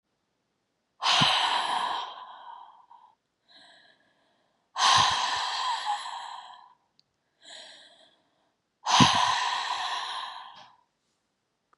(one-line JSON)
{"exhalation_length": "11.8 s", "exhalation_amplitude": 22364, "exhalation_signal_mean_std_ratio": 0.46, "survey_phase": "beta (2021-08-13 to 2022-03-07)", "age": "45-64", "gender": "Female", "wearing_mask": "No", "symptom_cough_any": true, "symptom_sore_throat": true, "symptom_fever_high_temperature": true, "symptom_headache": true, "symptom_other": true, "smoker_status": "Never smoked", "respiratory_condition_asthma": false, "respiratory_condition_other": true, "recruitment_source": "Test and Trace", "submission_delay": "2 days", "covid_test_result": "Positive", "covid_test_method": "LFT"}